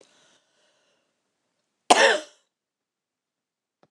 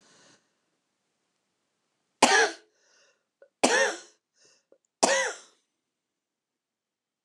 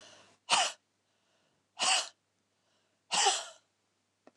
{"cough_length": "3.9 s", "cough_amplitude": 29118, "cough_signal_mean_std_ratio": 0.2, "three_cough_length": "7.2 s", "three_cough_amplitude": 26655, "three_cough_signal_mean_std_ratio": 0.27, "exhalation_length": "4.4 s", "exhalation_amplitude": 9447, "exhalation_signal_mean_std_ratio": 0.35, "survey_phase": "beta (2021-08-13 to 2022-03-07)", "age": "45-64", "gender": "Female", "wearing_mask": "No", "symptom_cough_any": true, "symptom_shortness_of_breath": true, "symptom_fatigue": true, "symptom_onset": "13 days", "smoker_status": "Ex-smoker", "respiratory_condition_asthma": true, "respiratory_condition_other": false, "recruitment_source": "REACT", "submission_delay": "1 day", "covid_test_result": "Negative", "covid_test_method": "RT-qPCR", "influenza_a_test_result": "Negative", "influenza_b_test_result": "Negative"}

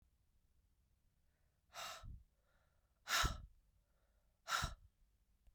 {"exhalation_length": "5.5 s", "exhalation_amplitude": 2164, "exhalation_signal_mean_std_ratio": 0.31, "survey_phase": "beta (2021-08-13 to 2022-03-07)", "age": "45-64", "gender": "Female", "wearing_mask": "No", "symptom_none": true, "smoker_status": "Never smoked", "respiratory_condition_asthma": false, "respiratory_condition_other": false, "recruitment_source": "REACT", "submission_delay": "2 days", "covid_test_result": "Negative", "covid_test_method": "RT-qPCR", "influenza_a_test_result": "Negative", "influenza_b_test_result": "Negative"}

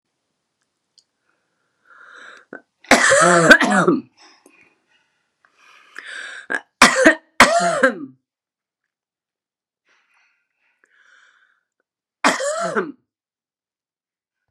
{"three_cough_length": "14.5 s", "three_cough_amplitude": 32768, "three_cough_signal_mean_std_ratio": 0.32, "survey_phase": "beta (2021-08-13 to 2022-03-07)", "age": "65+", "gender": "Female", "wearing_mask": "No", "symptom_none": true, "smoker_status": "Current smoker (1 to 10 cigarettes per day)", "respiratory_condition_asthma": false, "respiratory_condition_other": false, "recruitment_source": "REACT", "submission_delay": "0 days", "covid_test_result": "Negative", "covid_test_method": "RT-qPCR"}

